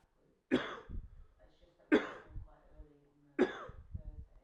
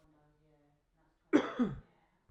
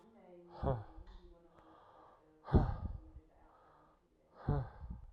{"three_cough_length": "4.4 s", "three_cough_amplitude": 5044, "three_cough_signal_mean_std_ratio": 0.34, "cough_length": "2.3 s", "cough_amplitude": 7297, "cough_signal_mean_std_ratio": 0.28, "exhalation_length": "5.1 s", "exhalation_amplitude": 5574, "exhalation_signal_mean_std_ratio": 0.36, "survey_phase": "alpha (2021-03-01 to 2021-08-12)", "age": "18-44", "gender": "Male", "wearing_mask": "No", "symptom_none": true, "smoker_status": "Ex-smoker", "respiratory_condition_asthma": false, "respiratory_condition_other": false, "recruitment_source": "REACT", "submission_delay": "1 day", "covid_test_result": "Negative", "covid_test_method": "RT-qPCR"}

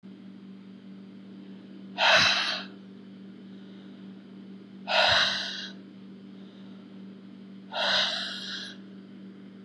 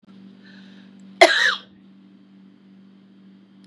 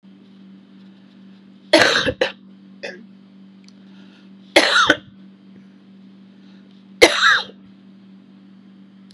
{"exhalation_length": "9.6 s", "exhalation_amplitude": 13153, "exhalation_signal_mean_std_ratio": 0.51, "cough_length": "3.7 s", "cough_amplitude": 32767, "cough_signal_mean_std_ratio": 0.26, "three_cough_length": "9.1 s", "three_cough_amplitude": 32768, "three_cough_signal_mean_std_ratio": 0.33, "survey_phase": "beta (2021-08-13 to 2022-03-07)", "age": "45-64", "gender": "Female", "wearing_mask": "No", "symptom_cough_any": true, "symptom_runny_or_blocked_nose": true, "symptom_sore_throat": true, "symptom_abdominal_pain": true, "symptom_fatigue": true, "symptom_other": true, "symptom_onset": "2 days", "smoker_status": "Never smoked", "respiratory_condition_asthma": false, "respiratory_condition_other": false, "recruitment_source": "Test and Trace", "submission_delay": "1 day", "covid_test_result": "Positive", "covid_test_method": "RT-qPCR", "covid_ct_value": 17.8, "covid_ct_gene": "N gene"}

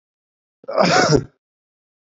{"cough_length": "2.1 s", "cough_amplitude": 27304, "cough_signal_mean_std_ratio": 0.4, "survey_phase": "beta (2021-08-13 to 2022-03-07)", "age": "45-64", "gender": "Male", "wearing_mask": "No", "symptom_cough_any": true, "symptom_runny_or_blocked_nose": true, "symptom_headache": true, "symptom_onset": "2 days", "smoker_status": "Ex-smoker", "respiratory_condition_asthma": false, "respiratory_condition_other": false, "recruitment_source": "Test and Trace", "submission_delay": "1 day", "covid_test_result": "Positive", "covid_test_method": "RT-qPCR", "covid_ct_value": 17.4, "covid_ct_gene": "ORF1ab gene", "covid_ct_mean": 17.7, "covid_viral_load": "1600000 copies/ml", "covid_viral_load_category": "High viral load (>1M copies/ml)"}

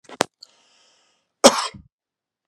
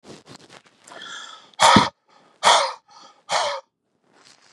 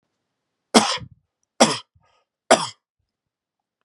{"cough_length": "2.5 s", "cough_amplitude": 32768, "cough_signal_mean_std_ratio": 0.19, "exhalation_length": "4.5 s", "exhalation_amplitude": 32610, "exhalation_signal_mean_std_ratio": 0.34, "three_cough_length": "3.8 s", "three_cough_amplitude": 32767, "three_cough_signal_mean_std_ratio": 0.25, "survey_phase": "beta (2021-08-13 to 2022-03-07)", "age": "45-64", "gender": "Male", "wearing_mask": "No", "symptom_none": true, "smoker_status": "Ex-smoker", "respiratory_condition_asthma": false, "respiratory_condition_other": false, "recruitment_source": "REACT", "submission_delay": "1 day", "covid_test_result": "Negative", "covid_test_method": "RT-qPCR", "influenza_a_test_result": "Negative", "influenza_b_test_result": "Negative"}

